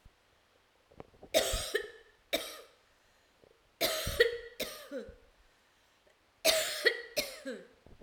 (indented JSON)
{
  "three_cough_length": "8.0 s",
  "three_cough_amplitude": 8839,
  "three_cough_signal_mean_std_ratio": 0.4,
  "survey_phase": "alpha (2021-03-01 to 2021-08-12)",
  "age": "45-64",
  "gender": "Female",
  "wearing_mask": "No",
  "symptom_none": true,
  "smoker_status": "Current smoker (e-cigarettes or vapes only)",
  "respiratory_condition_asthma": false,
  "respiratory_condition_other": false,
  "recruitment_source": "REACT",
  "submission_delay": "11 days",
  "covid_test_result": "Negative",
  "covid_test_method": "RT-qPCR"
}